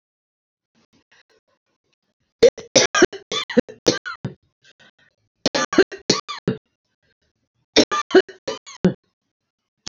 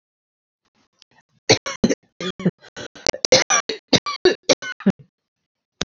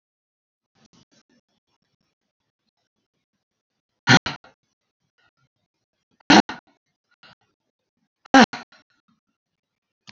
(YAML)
three_cough_length: 9.9 s
three_cough_amplitude: 29823
three_cough_signal_mean_std_ratio: 0.27
cough_length: 5.9 s
cough_amplitude: 30934
cough_signal_mean_std_ratio: 0.31
exhalation_length: 10.1 s
exhalation_amplitude: 32473
exhalation_signal_mean_std_ratio: 0.15
survey_phase: beta (2021-08-13 to 2022-03-07)
age: 65+
gender: Female
wearing_mask: 'No'
symptom_none: true
smoker_status: Ex-smoker
respiratory_condition_asthma: false
respiratory_condition_other: false
recruitment_source: REACT
submission_delay: 6 days
covid_test_result: Negative
covid_test_method: RT-qPCR
influenza_a_test_result: Negative
influenza_b_test_result: Negative